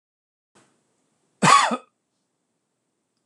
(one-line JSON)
{"cough_length": "3.3 s", "cough_amplitude": 24858, "cough_signal_mean_std_ratio": 0.24, "survey_phase": "alpha (2021-03-01 to 2021-08-12)", "age": "65+", "gender": "Male", "wearing_mask": "No", "symptom_none": true, "smoker_status": "Never smoked", "respiratory_condition_asthma": true, "respiratory_condition_other": false, "recruitment_source": "REACT", "submission_delay": "1 day", "covid_test_result": "Negative", "covid_test_method": "RT-qPCR"}